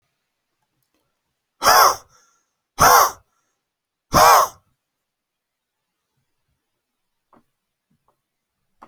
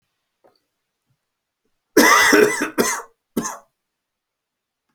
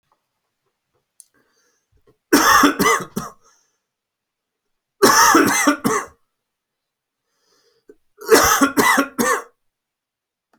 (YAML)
exhalation_length: 8.9 s
exhalation_amplitude: 31631
exhalation_signal_mean_std_ratio: 0.26
cough_length: 4.9 s
cough_amplitude: 32768
cough_signal_mean_std_ratio: 0.35
three_cough_length: 10.6 s
three_cough_amplitude: 31933
three_cough_signal_mean_std_ratio: 0.39
survey_phase: beta (2021-08-13 to 2022-03-07)
age: 18-44
gender: Male
wearing_mask: 'No'
symptom_cough_any: true
symptom_fatigue: true
symptom_onset: 1 day
smoker_status: Never smoked
respiratory_condition_asthma: false
respiratory_condition_other: false
recruitment_source: Test and Trace
submission_delay: 1 day
covid_test_result: Positive
covid_test_method: LAMP